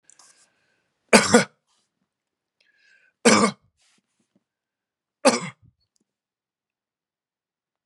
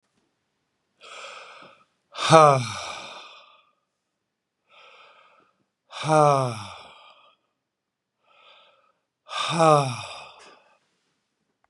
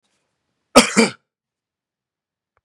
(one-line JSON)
{"three_cough_length": "7.9 s", "three_cough_amplitude": 32767, "three_cough_signal_mean_std_ratio": 0.21, "exhalation_length": "11.7 s", "exhalation_amplitude": 32591, "exhalation_signal_mean_std_ratio": 0.27, "cough_length": "2.6 s", "cough_amplitude": 32768, "cough_signal_mean_std_ratio": 0.22, "survey_phase": "beta (2021-08-13 to 2022-03-07)", "age": "45-64", "gender": "Male", "wearing_mask": "No", "symptom_runny_or_blocked_nose": true, "smoker_status": "Never smoked", "respiratory_condition_asthma": false, "respiratory_condition_other": false, "recruitment_source": "REACT", "submission_delay": "2 days", "covid_test_result": "Negative", "covid_test_method": "RT-qPCR"}